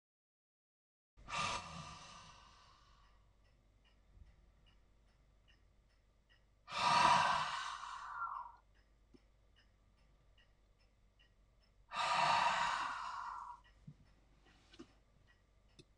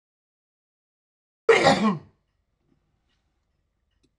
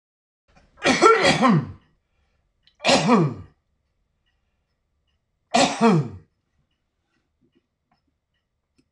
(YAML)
exhalation_length: 16.0 s
exhalation_amplitude: 4394
exhalation_signal_mean_std_ratio: 0.38
cough_length: 4.2 s
cough_amplitude: 18808
cough_signal_mean_std_ratio: 0.26
three_cough_length: 8.9 s
three_cough_amplitude: 26028
three_cough_signal_mean_std_ratio: 0.36
survey_phase: beta (2021-08-13 to 2022-03-07)
age: 65+
gender: Male
wearing_mask: 'No'
symptom_none: true
symptom_onset: 11 days
smoker_status: Ex-smoker
respiratory_condition_asthma: false
respiratory_condition_other: false
recruitment_source: REACT
submission_delay: 2 days
covid_test_result: Positive
covid_test_method: RT-qPCR
covid_ct_value: 29.7
covid_ct_gene: E gene
influenza_a_test_result: Negative
influenza_b_test_result: Negative